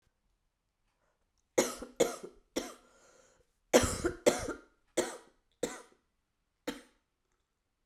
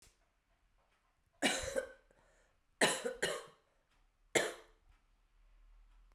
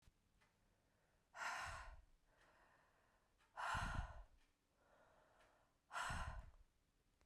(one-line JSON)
{"cough_length": "7.9 s", "cough_amplitude": 12042, "cough_signal_mean_std_ratio": 0.28, "three_cough_length": "6.1 s", "three_cough_amplitude": 6156, "three_cough_signal_mean_std_ratio": 0.32, "exhalation_length": "7.3 s", "exhalation_amplitude": 685, "exhalation_signal_mean_std_ratio": 0.44, "survey_phase": "beta (2021-08-13 to 2022-03-07)", "age": "45-64", "gender": "Female", "wearing_mask": "No", "symptom_cough_any": true, "symptom_new_continuous_cough": true, "symptom_runny_or_blocked_nose": true, "symptom_shortness_of_breath": true, "symptom_sore_throat": true, "symptom_fatigue": true, "symptom_fever_high_temperature": true, "symptom_headache": true, "symptom_change_to_sense_of_smell_or_taste": true, "symptom_other": true, "symptom_onset": "3 days", "smoker_status": "Ex-smoker", "respiratory_condition_asthma": false, "respiratory_condition_other": false, "recruitment_source": "Test and Trace", "submission_delay": "1 day", "covid_test_result": "Positive", "covid_test_method": "RT-qPCR", "covid_ct_value": 19.3, "covid_ct_gene": "ORF1ab gene"}